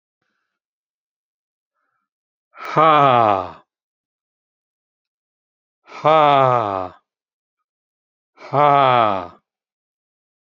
{
  "exhalation_length": "10.6 s",
  "exhalation_amplitude": 30859,
  "exhalation_signal_mean_std_ratio": 0.32,
  "survey_phase": "beta (2021-08-13 to 2022-03-07)",
  "age": "65+",
  "gender": "Male",
  "wearing_mask": "No",
  "symptom_cough_any": true,
  "smoker_status": "Ex-smoker",
  "respiratory_condition_asthma": false,
  "respiratory_condition_other": false,
  "recruitment_source": "REACT",
  "submission_delay": "1 day",
  "covid_test_result": "Negative",
  "covid_test_method": "RT-qPCR"
}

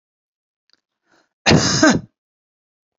{
  "cough_length": "3.0 s",
  "cough_amplitude": 31217,
  "cough_signal_mean_std_ratio": 0.32,
  "survey_phase": "beta (2021-08-13 to 2022-03-07)",
  "age": "45-64",
  "gender": "Female",
  "wearing_mask": "No",
  "symptom_none": true,
  "smoker_status": "Never smoked",
  "respiratory_condition_asthma": true,
  "respiratory_condition_other": false,
  "recruitment_source": "REACT",
  "submission_delay": "1 day",
  "covid_test_result": "Negative",
  "covid_test_method": "RT-qPCR"
}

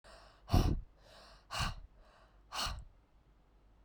{
  "exhalation_length": "3.8 s",
  "exhalation_amplitude": 5610,
  "exhalation_signal_mean_std_ratio": 0.37,
  "survey_phase": "beta (2021-08-13 to 2022-03-07)",
  "age": "18-44",
  "gender": "Female",
  "wearing_mask": "No",
  "symptom_new_continuous_cough": true,
  "symptom_fatigue": true,
  "symptom_headache": true,
  "symptom_change_to_sense_of_smell_or_taste": true,
  "symptom_loss_of_taste": true,
  "symptom_other": true,
  "symptom_onset": "4 days",
  "smoker_status": "Current smoker (e-cigarettes or vapes only)",
  "respiratory_condition_asthma": false,
  "respiratory_condition_other": false,
  "recruitment_source": "Test and Trace",
  "submission_delay": "2 days",
  "covid_test_result": "Positive",
  "covid_test_method": "RT-qPCR",
  "covid_ct_value": 15.9,
  "covid_ct_gene": "N gene",
  "covid_ct_mean": 16.3,
  "covid_viral_load": "4500000 copies/ml",
  "covid_viral_load_category": "High viral load (>1M copies/ml)"
}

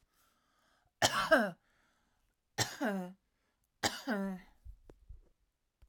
{
  "three_cough_length": "5.9 s",
  "three_cough_amplitude": 8256,
  "three_cough_signal_mean_std_ratio": 0.35,
  "survey_phase": "alpha (2021-03-01 to 2021-08-12)",
  "age": "45-64",
  "gender": "Female",
  "wearing_mask": "No",
  "symptom_none": true,
  "smoker_status": "Ex-smoker",
  "respiratory_condition_asthma": false,
  "respiratory_condition_other": false,
  "recruitment_source": "REACT",
  "submission_delay": "2 days",
  "covid_test_result": "Negative",
  "covid_test_method": "RT-qPCR"
}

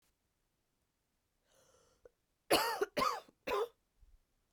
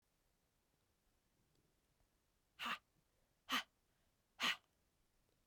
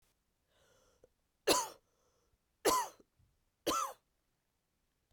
{
  "cough_length": "4.5 s",
  "cough_amplitude": 5017,
  "cough_signal_mean_std_ratio": 0.32,
  "exhalation_length": "5.5 s",
  "exhalation_amplitude": 1615,
  "exhalation_signal_mean_std_ratio": 0.24,
  "three_cough_length": "5.1 s",
  "three_cough_amplitude": 6504,
  "three_cough_signal_mean_std_ratio": 0.29,
  "survey_phase": "beta (2021-08-13 to 2022-03-07)",
  "age": "18-44",
  "gender": "Female",
  "wearing_mask": "No",
  "symptom_cough_any": true,
  "symptom_runny_or_blocked_nose": true,
  "symptom_shortness_of_breath": true,
  "symptom_fatigue": true,
  "symptom_headache": true,
  "smoker_status": "Never smoked",
  "respiratory_condition_asthma": false,
  "respiratory_condition_other": false,
  "recruitment_source": "Test and Trace",
  "submission_delay": "2 days",
  "covid_test_result": "Positive",
  "covid_test_method": "RT-qPCR",
  "covid_ct_value": 13.2,
  "covid_ct_gene": "ORF1ab gene"
}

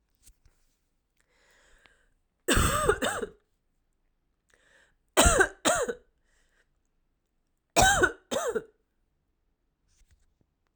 {
  "three_cough_length": "10.8 s",
  "three_cough_amplitude": 22194,
  "three_cough_signal_mean_std_ratio": 0.32,
  "survey_phase": "alpha (2021-03-01 to 2021-08-12)",
  "age": "18-44",
  "gender": "Female",
  "wearing_mask": "No",
  "symptom_cough_any": true,
  "symptom_fatigue": true,
  "symptom_headache": true,
  "symptom_onset": "5 days",
  "smoker_status": "Current smoker (e-cigarettes or vapes only)",
  "respiratory_condition_asthma": false,
  "respiratory_condition_other": false,
  "recruitment_source": "Test and Trace",
  "submission_delay": "2 days",
  "covid_test_result": "Positive",
  "covid_test_method": "ePCR"
}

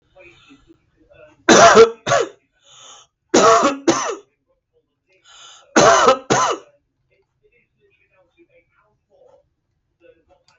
{
  "cough_length": "10.6 s",
  "cough_amplitude": 32768,
  "cough_signal_mean_std_ratio": 0.34,
  "survey_phase": "beta (2021-08-13 to 2022-03-07)",
  "age": "45-64",
  "gender": "Male",
  "wearing_mask": "Yes",
  "symptom_none": true,
  "smoker_status": "Ex-smoker",
  "respiratory_condition_asthma": false,
  "respiratory_condition_other": false,
  "recruitment_source": "REACT",
  "submission_delay": "3 days",
  "covid_test_result": "Negative",
  "covid_test_method": "RT-qPCR",
  "influenza_a_test_result": "Negative",
  "influenza_b_test_result": "Negative"
}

